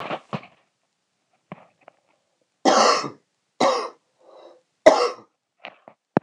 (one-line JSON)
{"three_cough_length": "6.2 s", "three_cough_amplitude": 26028, "three_cough_signal_mean_std_ratio": 0.31, "survey_phase": "beta (2021-08-13 to 2022-03-07)", "age": "18-44", "gender": "Male", "wearing_mask": "No", "symptom_cough_any": true, "symptom_runny_or_blocked_nose": true, "symptom_sore_throat": true, "symptom_fever_high_temperature": true, "symptom_headache": true, "symptom_onset": "3 days", "smoker_status": "Never smoked", "respiratory_condition_asthma": false, "respiratory_condition_other": false, "recruitment_source": "Test and Trace", "submission_delay": "1 day", "covid_test_result": "Positive", "covid_test_method": "RT-qPCR", "covid_ct_value": 16.9, "covid_ct_gene": "ORF1ab gene"}